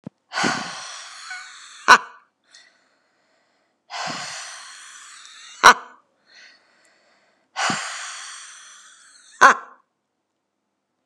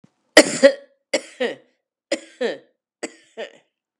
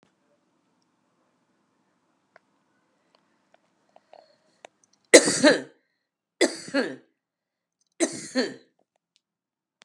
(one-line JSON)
{"exhalation_length": "11.1 s", "exhalation_amplitude": 32768, "exhalation_signal_mean_std_ratio": 0.24, "cough_length": "4.0 s", "cough_amplitude": 32768, "cough_signal_mean_std_ratio": 0.26, "three_cough_length": "9.8 s", "three_cough_amplitude": 32768, "three_cough_signal_mean_std_ratio": 0.2, "survey_phase": "beta (2021-08-13 to 2022-03-07)", "age": "45-64", "gender": "Female", "wearing_mask": "No", "symptom_runny_or_blocked_nose": true, "symptom_other": true, "symptom_onset": "5 days", "smoker_status": "Ex-smoker", "respiratory_condition_asthma": false, "respiratory_condition_other": false, "recruitment_source": "Test and Trace", "submission_delay": "2 days", "covid_test_result": "Positive", "covid_test_method": "RT-qPCR", "covid_ct_value": 22.5, "covid_ct_gene": "N gene"}